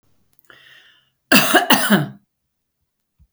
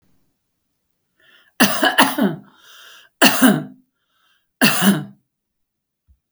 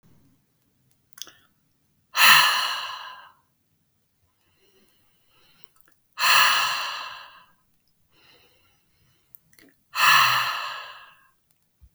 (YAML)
cough_length: 3.3 s
cough_amplitude: 32768
cough_signal_mean_std_ratio: 0.36
three_cough_length: 6.3 s
three_cough_amplitude: 32768
three_cough_signal_mean_std_ratio: 0.38
exhalation_length: 11.9 s
exhalation_amplitude: 28985
exhalation_signal_mean_std_ratio: 0.33
survey_phase: beta (2021-08-13 to 2022-03-07)
age: 45-64
gender: Female
wearing_mask: 'No'
symptom_none: true
smoker_status: Ex-smoker
respiratory_condition_asthma: false
respiratory_condition_other: false
recruitment_source: REACT
submission_delay: 2 days
covid_test_result: Negative
covid_test_method: RT-qPCR
influenza_a_test_result: Negative
influenza_b_test_result: Negative